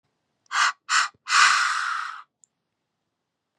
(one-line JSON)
{"exhalation_length": "3.6 s", "exhalation_amplitude": 23548, "exhalation_signal_mean_std_ratio": 0.45, "survey_phase": "beta (2021-08-13 to 2022-03-07)", "age": "45-64", "gender": "Female", "wearing_mask": "No", "symptom_none": true, "smoker_status": "Never smoked", "respiratory_condition_asthma": false, "respiratory_condition_other": false, "recruitment_source": "REACT", "submission_delay": "1 day", "covid_test_result": "Negative", "covid_test_method": "RT-qPCR"}